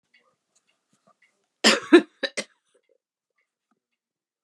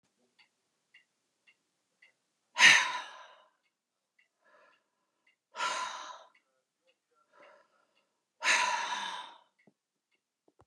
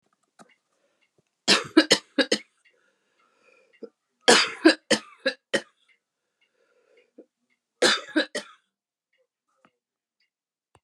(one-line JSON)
{"cough_length": "4.4 s", "cough_amplitude": 28552, "cough_signal_mean_std_ratio": 0.19, "exhalation_length": "10.7 s", "exhalation_amplitude": 14850, "exhalation_signal_mean_std_ratio": 0.25, "three_cough_length": "10.8 s", "three_cough_amplitude": 25793, "three_cough_signal_mean_std_ratio": 0.25, "survey_phase": "beta (2021-08-13 to 2022-03-07)", "age": "65+", "gender": "Female", "wearing_mask": "No", "symptom_cough_any": true, "symptom_runny_or_blocked_nose": true, "symptom_fatigue": true, "symptom_headache": true, "symptom_change_to_sense_of_smell_or_taste": true, "symptom_onset": "4 days", "smoker_status": "Never smoked", "respiratory_condition_asthma": false, "respiratory_condition_other": false, "recruitment_source": "Test and Trace", "submission_delay": "2 days", "covid_test_result": "Positive", "covid_test_method": "RT-qPCR", "covid_ct_value": 24.2, "covid_ct_gene": "ORF1ab gene", "covid_ct_mean": 25.1, "covid_viral_load": "5900 copies/ml", "covid_viral_load_category": "Minimal viral load (< 10K copies/ml)"}